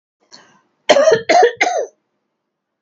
three_cough_length: 2.8 s
three_cough_amplitude: 30020
three_cough_signal_mean_std_ratio: 0.43
survey_phase: beta (2021-08-13 to 2022-03-07)
age: 45-64
gender: Female
wearing_mask: 'No'
symptom_none: true
smoker_status: Ex-smoker
respiratory_condition_asthma: true
respiratory_condition_other: false
recruitment_source: REACT
submission_delay: 2 days
covid_test_result: Negative
covid_test_method: RT-qPCR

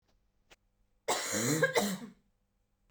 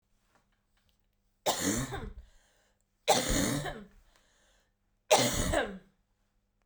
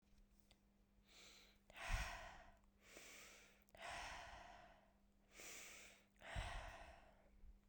cough_length: 2.9 s
cough_amplitude: 6232
cough_signal_mean_std_ratio: 0.45
three_cough_length: 6.7 s
three_cough_amplitude: 11430
three_cough_signal_mean_std_ratio: 0.41
exhalation_length: 7.7 s
exhalation_amplitude: 967
exhalation_signal_mean_std_ratio: 0.55
survey_phase: beta (2021-08-13 to 2022-03-07)
age: 18-44
gender: Female
wearing_mask: 'No'
symptom_cough_any: true
symptom_shortness_of_breath: true
symptom_sore_throat: true
symptom_fatigue: true
symptom_change_to_sense_of_smell_or_taste: true
symptom_other: true
symptom_onset: 2 days
smoker_status: Never smoked
respiratory_condition_asthma: false
respiratory_condition_other: false
recruitment_source: Test and Trace
submission_delay: 2 days
covid_test_result: Positive
covid_test_method: RT-qPCR
covid_ct_value: 31.7
covid_ct_gene: ORF1ab gene
covid_ct_mean: 31.9
covid_viral_load: 35 copies/ml
covid_viral_load_category: Minimal viral load (< 10K copies/ml)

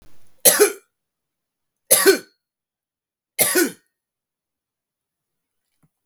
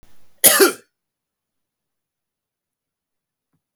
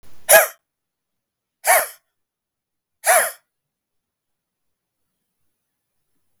three_cough_length: 6.1 s
three_cough_amplitude: 32768
three_cough_signal_mean_std_ratio: 0.28
cough_length: 3.8 s
cough_amplitude: 32768
cough_signal_mean_std_ratio: 0.22
exhalation_length: 6.4 s
exhalation_amplitude: 32768
exhalation_signal_mean_std_ratio: 0.24
survey_phase: beta (2021-08-13 to 2022-03-07)
age: 45-64
gender: Male
wearing_mask: 'No'
symptom_none: true
smoker_status: Never smoked
respiratory_condition_asthma: false
respiratory_condition_other: false
recruitment_source: REACT
submission_delay: 1 day
covid_test_result: Negative
covid_test_method: RT-qPCR
influenza_a_test_result: Negative
influenza_b_test_result: Negative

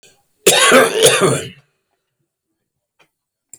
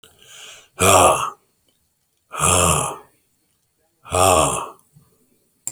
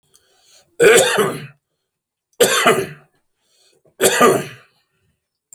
cough_length: 3.6 s
cough_amplitude: 32768
cough_signal_mean_std_ratio: 0.42
exhalation_length: 5.7 s
exhalation_amplitude: 32162
exhalation_signal_mean_std_ratio: 0.43
three_cough_length: 5.5 s
three_cough_amplitude: 32768
three_cough_signal_mean_std_ratio: 0.41
survey_phase: alpha (2021-03-01 to 2021-08-12)
age: 45-64
gender: Male
wearing_mask: 'No'
symptom_none: true
smoker_status: Never smoked
respiratory_condition_asthma: false
respiratory_condition_other: false
recruitment_source: REACT
submission_delay: 1 day
covid_test_result: Negative
covid_test_method: RT-qPCR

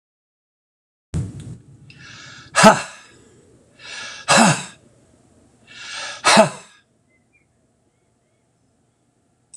exhalation_length: 9.6 s
exhalation_amplitude: 26028
exhalation_signal_mean_std_ratio: 0.28
survey_phase: alpha (2021-03-01 to 2021-08-12)
age: 65+
gender: Male
wearing_mask: 'No'
symptom_none: true
smoker_status: Never smoked
respiratory_condition_asthma: false
respiratory_condition_other: false
recruitment_source: REACT
submission_delay: 2 days
covid_test_result: Negative
covid_test_method: RT-qPCR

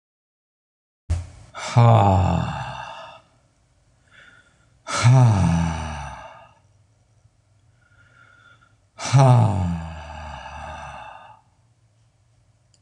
exhalation_length: 12.8 s
exhalation_amplitude: 25993
exhalation_signal_mean_std_ratio: 0.41
survey_phase: alpha (2021-03-01 to 2021-08-12)
age: 65+
gender: Male
wearing_mask: 'No'
symptom_none: true
smoker_status: Ex-smoker
respiratory_condition_asthma: false
respiratory_condition_other: false
recruitment_source: REACT
submission_delay: 1 day
covid_test_result: Negative
covid_test_method: RT-qPCR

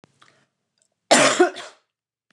cough_length: 2.3 s
cough_amplitude: 29203
cough_signal_mean_std_ratio: 0.33
survey_phase: beta (2021-08-13 to 2022-03-07)
age: 45-64
gender: Female
wearing_mask: 'No'
symptom_none: true
smoker_status: Never smoked
respiratory_condition_asthma: false
respiratory_condition_other: false
recruitment_source: REACT
submission_delay: 1 day
covid_test_result: Negative
covid_test_method: RT-qPCR
influenza_a_test_result: Negative
influenza_b_test_result: Negative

